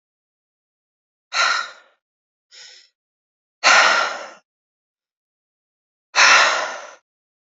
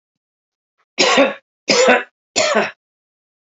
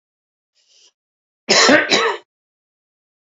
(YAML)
exhalation_length: 7.6 s
exhalation_amplitude: 29775
exhalation_signal_mean_std_ratio: 0.33
three_cough_length: 3.4 s
three_cough_amplitude: 30211
three_cough_signal_mean_std_ratio: 0.44
cough_length: 3.3 s
cough_amplitude: 32768
cough_signal_mean_std_ratio: 0.35
survey_phase: beta (2021-08-13 to 2022-03-07)
age: 45-64
gender: Male
wearing_mask: 'No'
symptom_cough_any: true
symptom_runny_or_blocked_nose: true
symptom_fatigue: true
symptom_headache: true
symptom_change_to_sense_of_smell_or_taste: true
smoker_status: Never smoked
respiratory_condition_asthma: false
respiratory_condition_other: false
recruitment_source: Test and Trace
submission_delay: 2 days
covid_test_result: Positive
covid_test_method: RT-qPCR
covid_ct_value: 25.0
covid_ct_gene: ORF1ab gene